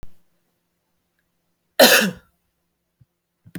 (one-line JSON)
{"cough_length": "3.6 s", "cough_amplitude": 30357, "cough_signal_mean_std_ratio": 0.24, "survey_phase": "beta (2021-08-13 to 2022-03-07)", "age": "45-64", "gender": "Female", "wearing_mask": "No", "symptom_none": true, "smoker_status": "Never smoked", "respiratory_condition_asthma": false, "respiratory_condition_other": false, "recruitment_source": "Test and Trace", "submission_delay": "0 days", "covid_test_result": "Negative", "covid_test_method": "LFT"}